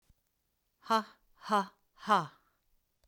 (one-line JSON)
{"exhalation_length": "3.1 s", "exhalation_amplitude": 6662, "exhalation_signal_mean_std_ratio": 0.3, "survey_phase": "beta (2021-08-13 to 2022-03-07)", "age": "45-64", "gender": "Female", "wearing_mask": "No", "symptom_none": true, "smoker_status": "Ex-smoker", "respiratory_condition_asthma": false, "respiratory_condition_other": false, "recruitment_source": "REACT", "submission_delay": "2 days", "covid_test_result": "Negative", "covid_test_method": "RT-qPCR", "influenza_a_test_result": "Negative", "influenza_b_test_result": "Negative"}